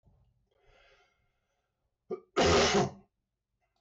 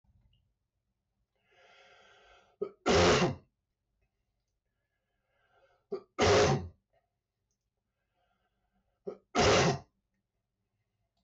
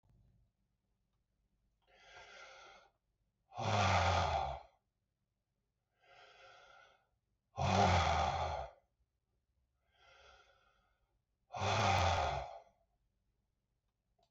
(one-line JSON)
{"cough_length": "3.8 s", "cough_amplitude": 4363, "cough_signal_mean_std_ratio": 0.35, "three_cough_length": "11.2 s", "three_cough_amplitude": 4612, "three_cough_signal_mean_std_ratio": 0.32, "exhalation_length": "14.3 s", "exhalation_amplitude": 3077, "exhalation_signal_mean_std_ratio": 0.39, "survey_phase": "beta (2021-08-13 to 2022-03-07)", "age": "65+", "gender": "Male", "wearing_mask": "No", "symptom_cough_any": true, "symptom_runny_or_blocked_nose": true, "symptom_sore_throat": true, "symptom_fatigue": true, "symptom_onset": "12 days", "smoker_status": "Ex-smoker", "respiratory_condition_asthma": false, "respiratory_condition_other": false, "recruitment_source": "REACT", "submission_delay": "3 days", "covid_test_result": "Negative", "covid_test_method": "RT-qPCR", "influenza_a_test_result": "Negative", "influenza_b_test_result": "Negative"}